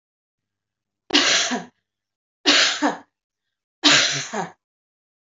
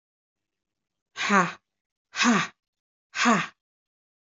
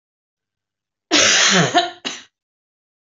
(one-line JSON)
{"three_cough_length": "5.3 s", "three_cough_amplitude": 25914, "three_cough_signal_mean_std_ratio": 0.41, "exhalation_length": "4.3 s", "exhalation_amplitude": 20965, "exhalation_signal_mean_std_ratio": 0.35, "cough_length": "3.1 s", "cough_amplitude": 27219, "cough_signal_mean_std_ratio": 0.43, "survey_phase": "beta (2021-08-13 to 2022-03-07)", "age": "45-64", "gender": "Female", "wearing_mask": "No", "symptom_none": true, "symptom_onset": "11 days", "smoker_status": "Never smoked", "respiratory_condition_asthma": false, "respiratory_condition_other": false, "recruitment_source": "REACT", "submission_delay": "2 days", "covid_test_result": "Negative", "covid_test_method": "RT-qPCR", "influenza_a_test_result": "Negative", "influenza_b_test_result": "Negative"}